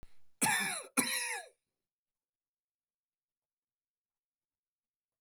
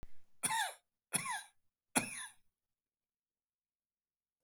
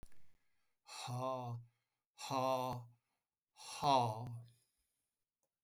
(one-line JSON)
{"cough_length": "5.2 s", "cough_amplitude": 6214, "cough_signal_mean_std_ratio": 0.32, "three_cough_length": "4.4 s", "three_cough_amplitude": 4918, "three_cough_signal_mean_std_ratio": 0.36, "exhalation_length": "5.6 s", "exhalation_amplitude": 3310, "exhalation_signal_mean_std_ratio": 0.46, "survey_phase": "alpha (2021-03-01 to 2021-08-12)", "age": "65+", "gender": "Male", "wearing_mask": "No", "symptom_none": true, "smoker_status": "Ex-smoker", "respiratory_condition_asthma": false, "respiratory_condition_other": false, "recruitment_source": "REACT", "submission_delay": "9 days", "covid_test_result": "Negative", "covid_test_method": "RT-qPCR"}